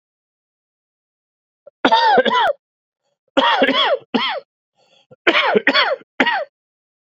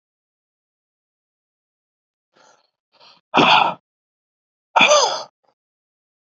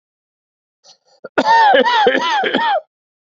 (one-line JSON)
{"three_cough_length": "7.2 s", "three_cough_amplitude": 32669, "three_cough_signal_mean_std_ratio": 0.48, "exhalation_length": "6.4 s", "exhalation_amplitude": 30946, "exhalation_signal_mean_std_ratio": 0.28, "cough_length": "3.2 s", "cough_amplitude": 27496, "cough_signal_mean_std_ratio": 0.6, "survey_phase": "beta (2021-08-13 to 2022-03-07)", "age": "45-64", "gender": "Male", "wearing_mask": "No", "symptom_cough_any": true, "symptom_new_continuous_cough": true, "symptom_runny_or_blocked_nose": true, "symptom_shortness_of_breath": true, "symptom_diarrhoea": true, "symptom_fatigue": true, "symptom_headache": true, "symptom_change_to_sense_of_smell_or_taste": true, "symptom_loss_of_taste": true, "symptom_onset": "4 days", "smoker_status": "Never smoked", "respiratory_condition_asthma": false, "respiratory_condition_other": false, "recruitment_source": "Test and Trace", "submission_delay": "2 days", "covid_test_result": "Positive", "covid_test_method": "ePCR"}